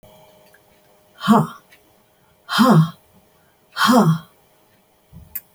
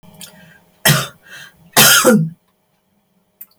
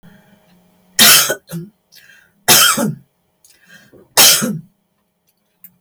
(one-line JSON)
{"exhalation_length": "5.5 s", "exhalation_amplitude": 28070, "exhalation_signal_mean_std_ratio": 0.37, "cough_length": "3.6 s", "cough_amplitude": 32768, "cough_signal_mean_std_ratio": 0.39, "three_cough_length": "5.8 s", "three_cough_amplitude": 32768, "three_cough_signal_mean_std_ratio": 0.37, "survey_phase": "beta (2021-08-13 to 2022-03-07)", "age": "65+", "gender": "Female", "wearing_mask": "No", "symptom_none": true, "smoker_status": "Never smoked", "respiratory_condition_asthma": false, "respiratory_condition_other": false, "recruitment_source": "REACT", "submission_delay": "1 day", "covid_test_result": "Negative", "covid_test_method": "RT-qPCR"}